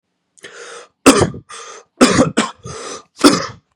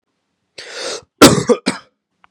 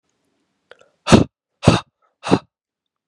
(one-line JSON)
{"three_cough_length": "3.8 s", "three_cough_amplitude": 32768, "three_cough_signal_mean_std_ratio": 0.4, "cough_length": "2.3 s", "cough_amplitude": 32768, "cough_signal_mean_std_ratio": 0.32, "exhalation_length": "3.1 s", "exhalation_amplitude": 32768, "exhalation_signal_mean_std_ratio": 0.25, "survey_phase": "beta (2021-08-13 to 2022-03-07)", "age": "18-44", "gender": "Male", "wearing_mask": "No", "symptom_cough_any": true, "symptom_runny_or_blocked_nose": true, "symptom_shortness_of_breath": true, "symptom_sore_throat": true, "symptom_fatigue": true, "symptom_fever_high_temperature": true, "symptom_headache": true, "symptom_other": true, "smoker_status": "Never smoked", "respiratory_condition_asthma": false, "respiratory_condition_other": false, "recruitment_source": "Test and Trace", "submission_delay": "1 day", "covid_test_result": "Positive", "covid_test_method": "RT-qPCR", "covid_ct_value": 16.2, "covid_ct_gene": "ORF1ab gene"}